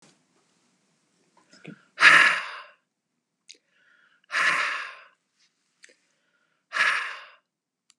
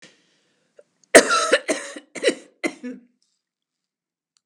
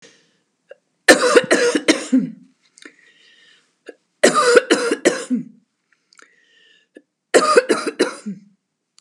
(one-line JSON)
{"exhalation_length": "8.0 s", "exhalation_amplitude": 27822, "exhalation_signal_mean_std_ratio": 0.29, "cough_length": "4.5 s", "cough_amplitude": 32768, "cough_signal_mean_std_ratio": 0.28, "three_cough_length": "9.0 s", "three_cough_amplitude": 32768, "three_cough_signal_mean_std_ratio": 0.4, "survey_phase": "beta (2021-08-13 to 2022-03-07)", "age": "65+", "gender": "Female", "wearing_mask": "No", "symptom_none": true, "smoker_status": "Never smoked", "respiratory_condition_asthma": false, "respiratory_condition_other": false, "recruitment_source": "REACT", "submission_delay": "2 days", "covid_test_result": "Negative", "covid_test_method": "RT-qPCR", "influenza_a_test_result": "Unknown/Void", "influenza_b_test_result": "Unknown/Void"}